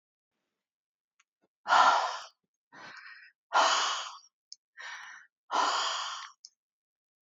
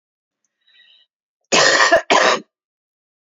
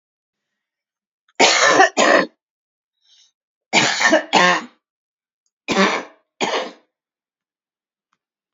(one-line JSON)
{"exhalation_length": "7.3 s", "exhalation_amplitude": 10194, "exhalation_signal_mean_std_ratio": 0.39, "cough_length": "3.2 s", "cough_amplitude": 32767, "cough_signal_mean_std_ratio": 0.4, "three_cough_length": "8.5 s", "three_cough_amplitude": 32120, "three_cough_signal_mean_std_ratio": 0.39, "survey_phase": "beta (2021-08-13 to 2022-03-07)", "age": "45-64", "gender": "Female", "wearing_mask": "No", "symptom_runny_or_blocked_nose": true, "symptom_change_to_sense_of_smell_or_taste": true, "smoker_status": "Never smoked", "respiratory_condition_asthma": true, "respiratory_condition_other": false, "recruitment_source": "REACT", "submission_delay": "2 days", "covid_test_result": "Negative", "covid_test_method": "RT-qPCR", "influenza_a_test_result": "Negative", "influenza_b_test_result": "Negative"}